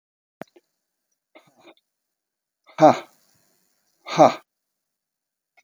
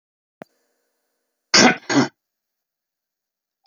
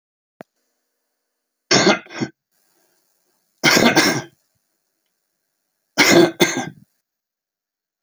exhalation_length: 5.6 s
exhalation_amplitude: 26372
exhalation_signal_mean_std_ratio: 0.18
cough_length: 3.7 s
cough_amplitude: 32768
cough_signal_mean_std_ratio: 0.25
three_cough_length: 8.0 s
three_cough_amplitude: 32767
three_cough_signal_mean_std_ratio: 0.33
survey_phase: beta (2021-08-13 to 2022-03-07)
age: 65+
gender: Male
wearing_mask: 'No'
symptom_none: true
smoker_status: Never smoked
respiratory_condition_asthma: false
respiratory_condition_other: false
recruitment_source: REACT
submission_delay: 2 days
covid_test_result: Negative
covid_test_method: RT-qPCR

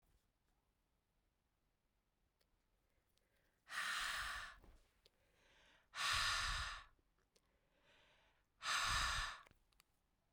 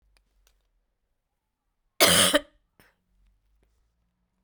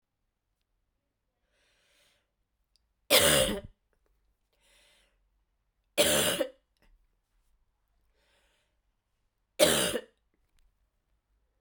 exhalation_length: 10.3 s
exhalation_amplitude: 1320
exhalation_signal_mean_std_ratio: 0.41
cough_length: 4.4 s
cough_amplitude: 20126
cough_signal_mean_std_ratio: 0.23
three_cough_length: 11.6 s
three_cough_amplitude: 14125
three_cough_signal_mean_std_ratio: 0.26
survey_phase: beta (2021-08-13 to 2022-03-07)
age: 45-64
gender: Female
wearing_mask: 'No'
symptom_cough_any: true
symptom_fatigue: true
symptom_headache: true
symptom_other: true
smoker_status: Never smoked
respiratory_condition_asthma: false
respiratory_condition_other: false
recruitment_source: Test and Trace
submission_delay: 2 days
covid_test_result: Positive
covid_test_method: RT-qPCR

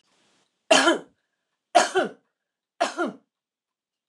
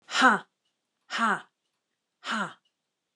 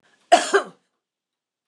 three_cough_length: 4.1 s
three_cough_amplitude: 25381
three_cough_signal_mean_std_ratio: 0.32
exhalation_length: 3.2 s
exhalation_amplitude: 18517
exhalation_signal_mean_std_ratio: 0.34
cough_length: 1.7 s
cough_amplitude: 28446
cough_signal_mean_std_ratio: 0.27
survey_phase: alpha (2021-03-01 to 2021-08-12)
age: 65+
gender: Female
wearing_mask: 'No'
symptom_none: true
smoker_status: Never smoked
respiratory_condition_asthma: false
respiratory_condition_other: false
recruitment_source: REACT
submission_delay: 1 day
covid_test_result: Negative
covid_test_method: RT-qPCR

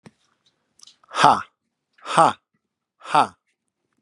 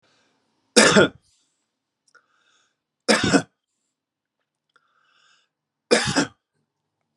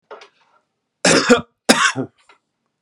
exhalation_length: 4.0 s
exhalation_amplitude: 32768
exhalation_signal_mean_std_ratio: 0.27
three_cough_length: 7.2 s
three_cough_amplitude: 32767
three_cough_signal_mean_std_ratio: 0.27
cough_length: 2.8 s
cough_amplitude: 32768
cough_signal_mean_std_ratio: 0.36
survey_phase: beta (2021-08-13 to 2022-03-07)
age: 45-64
gender: Male
wearing_mask: 'No'
symptom_runny_or_blocked_nose: true
symptom_fatigue: true
smoker_status: Never smoked
respiratory_condition_asthma: false
respiratory_condition_other: false
recruitment_source: Test and Trace
submission_delay: 2 days
covid_test_result: Positive
covid_test_method: RT-qPCR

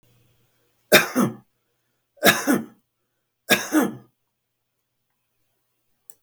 three_cough_length: 6.2 s
three_cough_amplitude: 32768
three_cough_signal_mean_std_ratio: 0.29
survey_phase: beta (2021-08-13 to 2022-03-07)
age: 65+
gender: Male
wearing_mask: 'No'
symptom_none: true
smoker_status: Ex-smoker
respiratory_condition_asthma: false
respiratory_condition_other: false
recruitment_source: REACT
submission_delay: 1 day
covid_test_result: Negative
covid_test_method: RT-qPCR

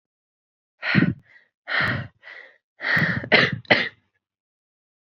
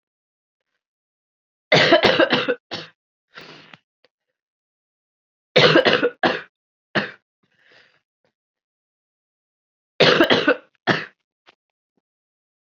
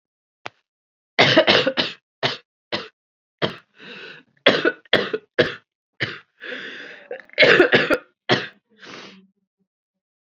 exhalation_length: 5.0 s
exhalation_amplitude: 28395
exhalation_signal_mean_std_ratio: 0.41
three_cough_length: 12.8 s
three_cough_amplitude: 30638
three_cough_signal_mean_std_ratio: 0.32
cough_length: 10.3 s
cough_amplitude: 32768
cough_signal_mean_std_ratio: 0.37
survey_phase: alpha (2021-03-01 to 2021-08-12)
age: 18-44
gender: Female
wearing_mask: 'No'
symptom_cough_any: true
symptom_new_continuous_cough: true
symptom_shortness_of_breath: true
symptom_abdominal_pain: true
symptom_fatigue: true
symptom_fever_high_temperature: true
symptom_headache: true
symptom_change_to_sense_of_smell_or_taste: true
symptom_onset: 3 days
smoker_status: Ex-smoker
respiratory_condition_asthma: false
respiratory_condition_other: false
recruitment_source: Test and Trace
submission_delay: 2 days
covid_test_result: Positive
covid_test_method: RT-qPCR
covid_ct_value: 18.3
covid_ct_gene: ORF1ab gene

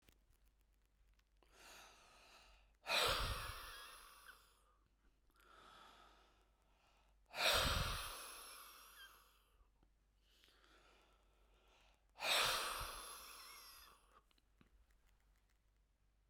exhalation_length: 16.3 s
exhalation_amplitude: 2485
exhalation_signal_mean_std_ratio: 0.37
survey_phase: beta (2021-08-13 to 2022-03-07)
age: 45-64
gender: Male
wearing_mask: 'No'
symptom_none: true
smoker_status: Ex-smoker
respiratory_condition_asthma: false
respiratory_condition_other: false
recruitment_source: REACT
submission_delay: 2 days
covid_test_result: Negative
covid_test_method: RT-qPCR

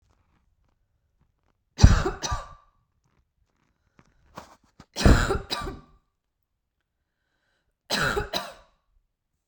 three_cough_length: 9.5 s
three_cough_amplitude: 32767
three_cough_signal_mean_std_ratio: 0.26
survey_phase: beta (2021-08-13 to 2022-03-07)
age: 18-44
gender: Female
wearing_mask: 'No'
symptom_none: true
smoker_status: Never smoked
respiratory_condition_asthma: false
respiratory_condition_other: false
recruitment_source: REACT
submission_delay: 32 days
covid_test_result: Negative
covid_test_method: RT-qPCR
influenza_a_test_result: Negative
influenza_b_test_result: Negative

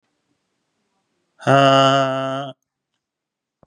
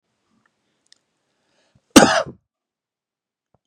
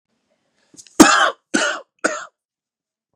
exhalation_length: 3.7 s
exhalation_amplitude: 30129
exhalation_signal_mean_std_ratio: 0.39
cough_length: 3.7 s
cough_amplitude: 32768
cough_signal_mean_std_ratio: 0.18
three_cough_length: 3.2 s
three_cough_amplitude: 32768
three_cough_signal_mean_std_ratio: 0.32
survey_phase: beta (2021-08-13 to 2022-03-07)
age: 45-64
gender: Male
wearing_mask: 'No'
symptom_none: true
smoker_status: Ex-smoker
respiratory_condition_asthma: false
respiratory_condition_other: false
recruitment_source: REACT
submission_delay: 0 days
covid_test_result: Negative
covid_test_method: RT-qPCR
influenza_a_test_result: Negative
influenza_b_test_result: Negative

